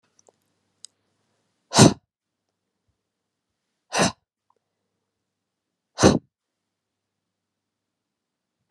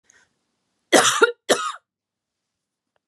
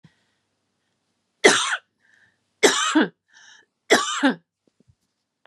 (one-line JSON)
{"exhalation_length": "8.7 s", "exhalation_amplitude": 31236, "exhalation_signal_mean_std_ratio": 0.17, "cough_length": "3.1 s", "cough_amplitude": 29782, "cough_signal_mean_std_ratio": 0.3, "three_cough_length": "5.5 s", "three_cough_amplitude": 32728, "three_cough_signal_mean_std_ratio": 0.34, "survey_phase": "beta (2021-08-13 to 2022-03-07)", "age": "18-44", "gender": "Female", "wearing_mask": "No", "symptom_runny_or_blocked_nose": true, "symptom_fatigue": true, "symptom_other": true, "smoker_status": "Never smoked", "respiratory_condition_asthma": false, "respiratory_condition_other": false, "recruitment_source": "Test and Trace", "submission_delay": "2 days", "covid_test_result": "Negative", "covid_test_method": "RT-qPCR"}